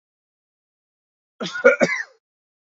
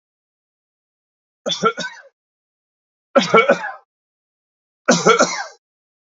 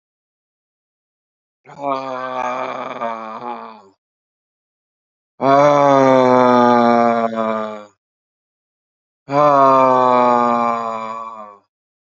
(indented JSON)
{
  "cough_length": "2.6 s",
  "cough_amplitude": 29460,
  "cough_signal_mean_std_ratio": 0.28,
  "three_cough_length": "6.1 s",
  "three_cough_amplitude": 32163,
  "three_cough_signal_mean_std_ratio": 0.32,
  "exhalation_length": "12.0 s",
  "exhalation_amplitude": 32550,
  "exhalation_signal_mean_std_ratio": 0.52,
  "survey_phase": "beta (2021-08-13 to 2022-03-07)",
  "age": "45-64",
  "gender": "Male",
  "wearing_mask": "No",
  "symptom_none": true,
  "smoker_status": "Ex-smoker",
  "respiratory_condition_asthma": true,
  "respiratory_condition_other": true,
  "recruitment_source": "Test and Trace",
  "submission_delay": "10 days",
  "covid_test_result": "Negative",
  "covid_test_method": "RT-qPCR"
}